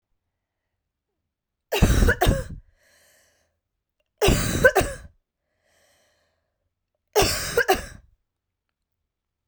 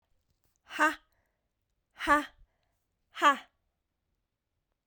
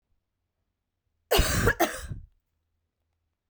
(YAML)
three_cough_length: 9.5 s
three_cough_amplitude: 27216
three_cough_signal_mean_std_ratio: 0.34
exhalation_length: 4.9 s
exhalation_amplitude: 10401
exhalation_signal_mean_std_ratio: 0.25
cough_length: 3.5 s
cough_amplitude: 11825
cough_signal_mean_std_ratio: 0.33
survey_phase: beta (2021-08-13 to 2022-03-07)
age: 18-44
gender: Female
wearing_mask: 'No'
symptom_cough_any: true
symptom_runny_or_blocked_nose: true
symptom_shortness_of_breath: true
symptom_sore_throat: true
symptom_diarrhoea: true
symptom_fatigue: true
symptom_fever_high_temperature: true
symptom_headache: true
symptom_change_to_sense_of_smell_or_taste: true
symptom_other: true
symptom_onset: 9 days
smoker_status: Never smoked
respiratory_condition_asthma: true
respiratory_condition_other: false
recruitment_source: Test and Trace
submission_delay: 2 days
covid_test_result: Positive
covid_test_method: RT-qPCR
covid_ct_value: 18.8
covid_ct_gene: ORF1ab gene